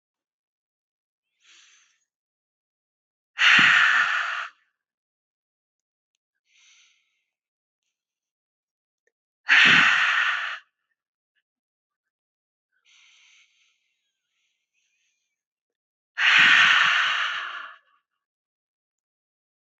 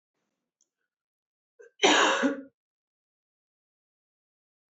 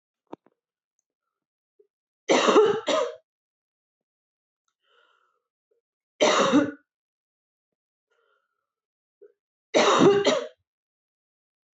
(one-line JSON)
{"exhalation_length": "19.8 s", "exhalation_amplitude": 19989, "exhalation_signal_mean_std_ratio": 0.32, "cough_length": "4.7 s", "cough_amplitude": 13447, "cough_signal_mean_std_ratio": 0.27, "three_cough_length": "11.8 s", "three_cough_amplitude": 16622, "three_cough_signal_mean_std_ratio": 0.32, "survey_phase": "beta (2021-08-13 to 2022-03-07)", "age": "18-44", "gender": "Female", "wearing_mask": "No", "symptom_none": true, "smoker_status": "Ex-smoker", "respiratory_condition_asthma": false, "respiratory_condition_other": false, "recruitment_source": "REACT", "submission_delay": "4 days", "covid_test_result": "Negative", "covid_test_method": "RT-qPCR", "influenza_a_test_result": "Negative", "influenza_b_test_result": "Negative"}